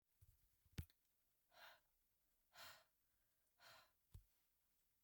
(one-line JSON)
{"exhalation_length": "5.0 s", "exhalation_amplitude": 394, "exhalation_signal_mean_std_ratio": 0.33, "survey_phase": "beta (2021-08-13 to 2022-03-07)", "age": "65+", "gender": "Female", "wearing_mask": "No", "symptom_none": true, "smoker_status": "Never smoked", "respiratory_condition_asthma": false, "respiratory_condition_other": false, "recruitment_source": "REACT", "submission_delay": "8 days", "covid_test_result": "Negative", "covid_test_method": "RT-qPCR"}